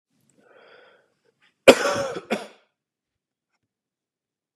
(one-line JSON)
{"cough_length": "4.6 s", "cough_amplitude": 32768, "cough_signal_mean_std_ratio": 0.19, "survey_phase": "beta (2021-08-13 to 2022-03-07)", "age": "18-44", "gender": "Male", "wearing_mask": "No", "symptom_cough_any": true, "symptom_runny_or_blocked_nose": true, "symptom_sore_throat": true, "symptom_onset": "3 days", "smoker_status": "Never smoked", "respiratory_condition_asthma": false, "respiratory_condition_other": false, "recruitment_source": "Test and Trace", "submission_delay": "2 days", "covid_test_result": "Positive", "covid_test_method": "RT-qPCR", "covid_ct_value": 29.0, "covid_ct_gene": "N gene", "covid_ct_mean": 29.0, "covid_viral_load": "300 copies/ml", "covid_viral_load_category": "Minimal viral load (< 10K copies/ml)"}